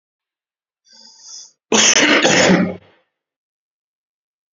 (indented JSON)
{
  "cough_length": "4.5 s",
  "cough_amplitude": 32768,
  "cough_signal_mean_std_ratio": 0.4,
  "survey_phase": "beta (2021-08-13 to 2022-03-07)",
  "age": "18-44",
  "gender": "Male",
  "wearing_mask": "No",
  "symptom_none": true,
  "smoker_status": "Never smoked",
  "respiratory_condition_asthma": false,
  "respiratory_condition_other": false,
  "recruitment_source": "REACT",
  "submission_delay": "3 days",
  "covid_test_result": "Negative",
  "covid_test_method": "RT-qPCR",
  "influenza_a_test_result": "Negative",
  "influenza_b_test_result": "Negative"
}